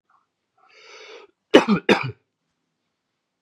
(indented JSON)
{
  "cough_length": "3.4 s",
  "cough_amplitude": 32767,
  "cough_signal_mean_std_ratio": 0.24,
  "survey_phase": "beta (2021-08-13 to 2022-03-07)",
  "age": "45-64",
  "gender": "Male",
  "wearing_mask": "No",
  "symptom_cough_any": true,
  "symptom_runny_or_blocked_nose": true,
  "symptom_loss_of_taste": true,
  "symptom_onset": "3 days",
  "smoker_status": "Never smoked",
  "respiratory_condition_asthma": false,
  "respiratory_condition_other": false,
  "recruitment_source": "Test and Trace",
  "submission_delay": "1 day",
  "covid_test_result": "Positive",
  "covid_test_method": "RT-qPCR",
  "covid_ct_value": 14.8,
  "covid_ct_gene": "ORF1ab gene",
  "covid_ct_mean": 15.0,
  "covid_viral_load": "12000000 copies/ml",
  "covid_viral_load_category": "High viral load (>1M copies/ml)"
}